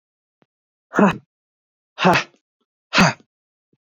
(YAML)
exhalation_length: 3.8 s
exhalation_amplitude: 27864
exhalation_signal_mean_std_ratio: 0.3
survey_phase: beta (2021-08-13 to 2022-03-07)
age: 18-44
gender: Male
wearing_mask: 'No'
symptom_none: true
smoker_status: Never smoked
respiratory_condition_asthma: false
respiratory_condition_other: false
recruitment_source: REACT
submission_delay: 1 day
covid_test_result: Negative
covid_test_method: RT-qPCR
influenza_a_test_result: Negative
influenza_b_test_result: Negative